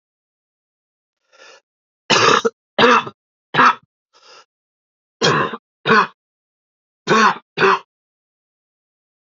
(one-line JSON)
{"three_cough_length": "9.4 s", "three_cough_amplitude": 30626, "three_cough_signal_mean_std_ratio": 0.35, "survey_phase": "alpha (2021-03-01 to 2021-08-12)", "age": "18-44", "gender": "Male", "wearing_mask": "No", "symptom_cough_any": true, "symptom_new_continuous_cough": true, "symptom_onset": "2 days", "smoker_status": "Never smoked", "respiratory_condition_asthma": false, "respiratory_condition_other": false, "recruitment_source": "Test and Trace", "submission_delay": "1 day", "covid_test_result": "Positive", "covid_test_method": "RT-qPCR", "covid_ct_value": 28.7, "covid_ct_gene": "N gene"}